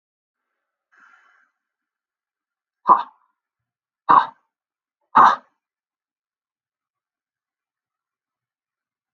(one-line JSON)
{"exhalation_length": "9.1 s", "exhalation_amplitude": 28669, "exhalation_signal_mean_std_ratio": 0.18, "survey_phase": "alpha (2021-03-01 to 2021-08-12)", "age": "45-64", "gender": "Male", "wearing_mask": "No", "symptom_none": true, "smoker_status": "Never smoked", "respiratory_condition_asthma": false, "respiratory_condition_other": false, "recruitment_source": "REACT", "submission_delay": "2 days", "covid_test_result": "Negative", "covid_test_method": "RT-qPCR"}